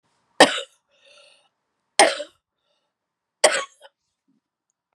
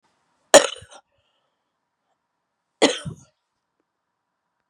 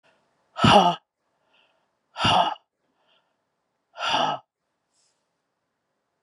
{
  "three_cough_length": "4.9 s",
  "three_cough_amplitude": 32768,
  "three_cough_signal_mean_std_ratio": 0.22,
  "cough_length": "4.7 s",
  "cough_amplitude": 32768,
  "cough_signal_mean_std_ratio": 0.16,
  "exhalation_length": "6.2 s",
  "exhalation_amplitude": 25955,
  "exhalation_signal_mean_std_ratio": 0.31,
  "survey_phase": "beta (2021-08-13 to 2022-03-07)",
  "age": "45-64",
  "gender": "Female",
  "wearing_mask": "No",
  "symptom_cough_any": true,
  "symptom_new_continuous_cough": true,
  "symptom_runny_or_blocked_nose": true,
  "symptom_sore_throat": true,
  "symptom_headache": true,
  "symptom_onset": "3 days",
  "smoker_status": "Never smoked",
  "respiratory_condition_asthma": false,
  "respiratory_condition_other": false,
  "recruitment_source": "Test and Trace",
  "submission_delay": "1 day",
  "covid_test_result": "Positive",
  "covid_test_method": "RT-qPCR",
  "covid_ct_value": 28.5,
  "covid_ct_gene": "N gene"
}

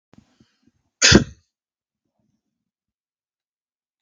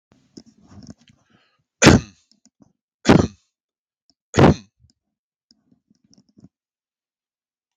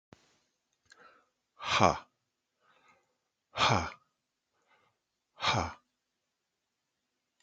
{
  "cough_length": "4.0 s",
  "cough_amplitude": 32768,
  "cough_signal_mean_std_ratio": 0.17,
  "three_cough_length": "7.8 s",
  "three_cough_amplitude": 32768,
  "three_cough_signal_mean_std_ratio": 0.2,
  "exhalation_length": "7.4 s",
  "exhalation_amplitude": 13712,
  "exhalation_signal_mean_std_ratio": 0.25,
  "survey_phase": "beta (2021-08-13 to 2022-03-07)",
  "age": "45-64",
  "gender": "Male",
  "wearing_mask": "No",
  "symptom_none": true,
  "smoker_status": "Never smoked",
  "respiratory_condition_asthma": false,
  "respiratory_condition_other": false,
  "recruitment_source": "REACT",
  "submission_delay": "2 days",
  "covid_test_result": "Negative",
  "covid_test_method": "RT-qPCR",
  "influenza_a_test_result": "Negative",
  "influenza_b_test_result": "Negative"
}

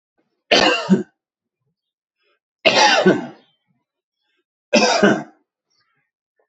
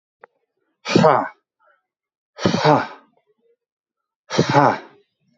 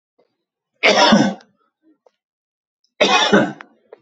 {
  "three_cough_length": "6.5 s",
  "three_cough_amplitude": 29275,
  "three_cough_signal_mean_std_ratio": 0.38,
  "exhalation_length": "5.4 s",
  "exhalation_amplitude": 27676,
  "exhalation_signal_mean_std_ratio": 0.35,
  "cough_length": "4.0 s",
  "cough_amplitude": 30209,
  "cough_signal_mean_std_ratio": 0.41,
  "survey_phase": "alpha (2021-03-01 to 2021-08-12)",
  "age": "45-64",
  "gender": "Male",
  "wearing_mask": "No",
  "symptom_fatigue": true,
  "symptom_headache": true,
  "symptom_onset": "12 days",
  "smoker_status": "Ex-smoker",
  "respiratory_condition_asthma": false,
  "respiratory_condition_other": false,
  "recruitment_source": "REACT",
  "submission_delay": "3 days",
  "covid_test_result": "Negative",
  "covid_test_method": "RT-qPCR"
}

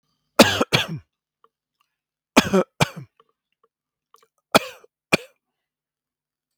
{
  "three_cough_length": "6.6 s",
  "three_cough_amplitude": 32768,
  "three_cough_signal_mean_std_ratio": 0.23,
  "survey_phase": "beta (2021-08-13 to 2022-03-07)",
  "age": "45-64",
  "gender": "Male",
  "wearing_mask": "No",
  "symptom_none": true,
  "symptom_onset": "5 days",
  "smoker_status": "Ex-smoker",
  "respiratory_condition_asthma": true,
  "respiratory_condition_other": false,
  "recruitment_source": "REACT",
  "submission_delay": "2 days",
  "covid_test_result": "Positive",
  "covid_test_method": "RT-qPCR",
  "covid_ct_value": 20.7,
  "covid_ct_gene": "E gene",
  "influenza_a_test_result": "Negative",
  "influenza_b_test_result": "Negative"
}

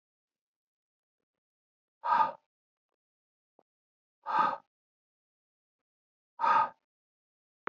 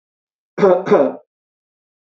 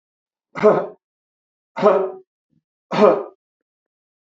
{
  "exhalation_length": "7.7 s",
  "exhalation_amplitude": 7168,
  "exhalation_signal_mean_std_ratio": 0.26,
  "cough_length": "2.0 s",
  "cough_amplitude": 31636,
  "cough_signal_mean_std_ratio": 0.38,
  "three_cough_length": "4.3 s",
  "three_cough_amplitude": 29942,
  "three_cough_signal_mean_std_ratio": 0.34,
  "survey_phase": "beta (2021-08-13 to 2022-03-07)",
  "age": "65+",
  "gender": "Male",
  "wearing_mask": "No",
  "symptom_none": true,
  "smoker_status": "Never smoked",
  "respiratory_condition_asthma": false,
  "respiratory_condition_other": false,
  "recruitment_source": "REACT",
  "submission_delay": "0 days",
  "covid_test_result": "Negative",
  "covid_test_method": "RT-qPCR"
}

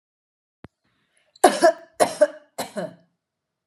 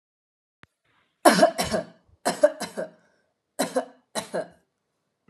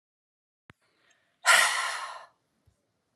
{
  "cough_length": "3.7 s",
  "cough_amplitude": 32765,
  "cough_signal_mean_std_ratio": 0.28,
  "three_cough_length": "5.3 s",
  "three_cough_amplitude": 28781,
  "three_cough_signal_mean_std_ratio": 0.32,
  "exhalation_length": "3.2 s",
  "exhalation_amplitude": 13570,
  "exhalation_signal_mean_std_ratio": 0.31,
  "survey_phase": "beta (2021-08-13 to 2022-03-07)",
  "age": "18-44",
  "gender": "Female",
  "wearing_mask": "No",
  "symptom_sore_throat": true,
  "symptom_headache": true,
  "symptom_onset": "6 days",
  "smoker_status": "Never smoked",
  "respiratory_condition_asthma": false,
  "respiratory_condition_other": false,
  "recruitment_source": "REACT",
  "submission_delay": "1 day",
  "covid_test_result": "Negative",
  "covid_test_method": "RT-qPCR",
  "influenza_a_test_result": "Unknown/Void",
  "influenza_b_test_result": "Unknown/Void"
}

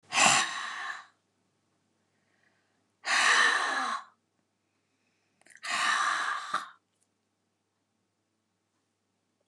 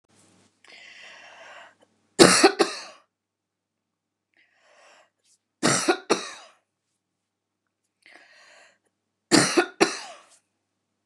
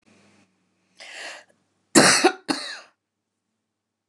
{
  "exhalation_length": "9.5 s",
  "exhalation_amplitude": 13505,
  "exhalation_signal_mean_std_ratio": 0.4,
  "three_cough_length": "11.1 s",
  "three_cough_amplitude": 29204,
  "three_cough_signal_mean_std_ratio": 0.26,
  "cough_length": "4.1 s",
  "cough_amplitude": 29090,
  "cough_signal_mean_std_ratio": 0.28,
  "survey_phase": "beta (2021-08-13 to 2022-03-07)",
  "age": "45-64",
  "gender": "Female",
  "wearing_mask": "No",
  "symptom_none": true,
  "smoker_status": "Never smoked",
  "respiratory_condition_asthma": true,
  "respiratory_condition_other": false,
  "recruitment_source": "REACT",
  "submission_delay": "2 days",
  "covid_test_result": "Negative",
  "covid_test_method": "RT-qPCR",
  "influenza_a_test_result": "Negative",
  "influenza_b_test_result": "Negative"
}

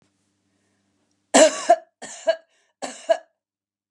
{
  "three_cough_length": "3.9 s",
  "three_cough_amplitude": 27675,
  "three_cough_signal_mean_std_ratio": 0.28,
  "survey_phase": "beta (2021-08-13 to 2022-03-07)",
  "age": "45-64",
  "gender": "Female",
  "wearing_mask": "No",
  "symptom_none": true,
  "symptom_onset": "12 days",
  "smoker_status": "Never smoked",
  "respiratory_condition_asthma": false,
  "respiratory_condition_other": false,
  "recruitment_source": "REACT",
  "submission_delay": "1 day",
  "covid_test_result": "Negative",
  "covid_test_method": "RT-qPCR",
  "influenza_a_test_result": "Negative",
  "influenza_b_test_result": "Negative"
}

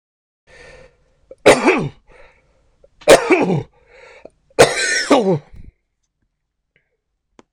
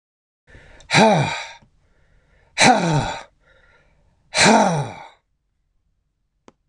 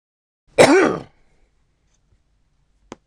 {
  "three_cough_length": "7.5 s",
  "three_cough_amplitude": 26028,
  "three_cough_signal_mean_std_ratio": 0.35,
  "exhalation_length": "6.7 s",
  "exhalation_amplitude": 26028,
  "exhalation_signal_mean_std_ratio": 0.39,
  "cough_length": "3.1 s",
  "cough_amplitude": 26028,
  "cough_signal_mean_std_ratio": 0.28,
  "survey_phase": "beta (2021-08-13 to 2022-03-07)",
  "age": "65+",
  "gender": "Male",
  "wearing_mask": "No",
  "symptom_none": true,
  "smoker_status": "Never smoked",
  "respiratory_condition_asthma": false,
  "respiratory_condition_other": false,
  "recruitment_source": "REACT",
  "submission_delay": "2 days",
  "covid_test_result": "Negative",
  "covid_test_method": "RT-qPCR",
  "influenza_a_test_result": "Unknown/Void",
  "influenza_b_test_result": "Unknown/Void"
}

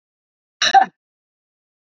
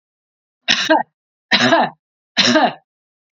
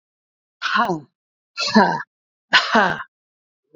{
  "cough_length": "1.9 s",
  "cough_amplitude": 27647,
  "cough_signal_mean_std_ratio": 0.25,
  "three_cough_length": "3.3 s",
  "three_cough_amplitude": 32767,
  "three_cough_signal_mean_std_ratio": 0.46,
  "exhalation_length": "3.8 s",
  "exhalation_amplitude": 32767,
  "exhalation_signal_mean_std_ratio": 0.41,
  "survey_phase": "beta (2021-08-13 to 2022-03-07)",
  "age": "45-64",
  "gender": "Female",
  "wearing_mask": "No",
  "symptom_none": true,
  "smoker_status": "Never smoked",
  "respiratory_condition_asthma": false,
  "respiratory_condition_other": false,
  "recruitment_source": "REACT",
  "submission_delay": "2 days",
  "covid_test_result": "Negative",
  "covid_test_method": "RT-qPCR"
}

